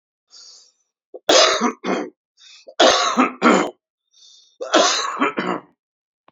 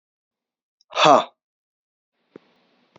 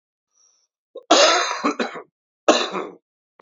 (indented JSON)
{
  "three_cough_length": "6.3 s",
  "three_cough_amplitude": 32413,
  "three_cough_signal_mean_std_ratio": 0.46,
  "exhalation_length": "3.0 s",
  "exhalation_amplitude": 27803,
  "exhalation_signal_mean_std_ratio": 0.22,
  "cough_length": "3.4 s",
  "cough_amplitude": 32767,
  "cough_signal_mean_std_ratio": 0.41,
  "survey_phase": "alpha (2021-03-01 to 2021-08-12)",
  "age": "18-44",
  "gender": "Male",
  "wearing_mask": "No",
  "symptom_cough_any": true,
  "smoker_status": "Current smoker (11 or more cigarettes per day)",
  "respiratory_condition_asthma": false,
  "respiratory_condition_other": false,
  "recruitment_source": "Test and Trace",
  "submission_delay": "2 days",
  "covid_test_result": "Positive",
  "covid_test_method": "RT-qPCR",
  "covid_ct_value": 18.5,
  "covid_ct_gene": "ORF1ab gene",
  "covid_ct_mean": 19.3,
  "covid_viral_load": "460000 copies/ml",
  "covid_viral_load_category": "Low viral load (10K-1M copies/ml)"
}